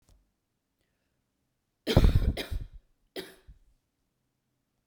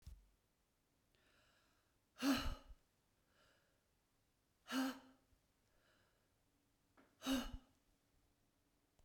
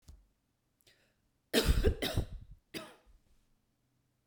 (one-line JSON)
{"three_cough_length": "4.9 s", "three_cough_amplitude": 16671, "three_cough_signal_mean_std_ratio": 0.26, "exhalation_length": "9.0 s", "exhalation_amplitude": 1541, "exhalation_signal_mean_std_ratio": 0.28, "cough_length": "4.3 s", "cough_amplitude": 6182, "cough_signal_mean_std_ratio": 0.32, "survey_phase": "beta (2021-08-13 to 2022-03-07)", "age": "45-64", "gender": "Female", "wearing_mask": "No", "symptom_none": true, "smoker_status": "Never smoked", "respiratory_condition_asthma": true, "respiratory_condition_other": false, "recruitment_source": "REACT", "submission_delay": "1 day", "covid_test_result": "Negative", "covid_test_method": "RT-qPCR", "influenza_a_test_result": "Negative", "influenza_b_test_result": "Negative"}